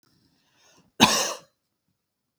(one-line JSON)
{"three_cough_length": "2.4 s", "three_cough_amplitude": 32768, "three_cough_signal_mean_std_ratio": 0.25, "survey_phase": "beta (2021-08-13 to 2022-03-07)", "age": "45-64", "gender": "Female", "wearing_mask": "No", "symptom_none": true, "smoker_status": "Ex-smoker", "respiratory_condition_asthma": false, "respiratory_condition_other": false, "recruitment_source": "REACT", "submission_delay": "3 days", "covid_test_result": "Negative", "covid_test_method": "RT-qPCR", "influenza_a_test_result": "Unknown/Void", "influenza_b_test_result": "Unknown/Void"}